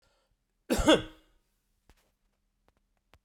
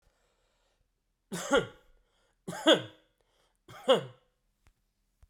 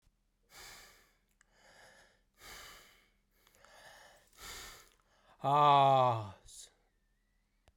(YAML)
cough_length: 3.2 s
cough_amplitude: 11664
cough_signal_mean_std_ratio: 0.23
three_cough_length: 5.3 s
three_cough_amplitude: 11373
three_cough_signal_mean_std_ratio: 0.25
exhalation_length: 7.8 s
exhalation_amplitude: 6261
exhalation_signal_mean_std_ratio: 0.29
survey_phase: beta (2021-08-13 to 2022-03-07)
age: 45-64
gender: Male
wearing_mask: 'No'
symptom_none: true
smoker_status: Never smoked
respiratory_condition_asthma: false
respiratory_condition_other: false
recruitment_source: REACT
submission_delay: 10 days
covid_test_result: Negative
covid_test_method: RT-qPCR